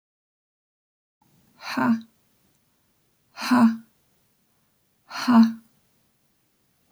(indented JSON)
{
  "exhalation_length": "6.9 s",
  "exhalation_amplitude": 15674,
  "exhalation_signal_mean_std_ratio": 0.29,
  "survey_phase": "beta (2021-08-13 to 2022-03-07)",
  "age": "18-44",
  "gender": "Female",
  "wearing_mask": "No",
  "symptom_abdominal_pain": true,
  "symptom_fatigue": true,
  "symptom_onset": "12 days",
  "smoker_status": "Never smoked",
  "respiratory_condition_asthma": false,
  "respiratory_condition_other": false,
  "recruitment_source": "REACT",
  "submission_delay": "3 days",
  "covid_test_result": "Negative",
  "covid_test_method": "RT-qPCR"
}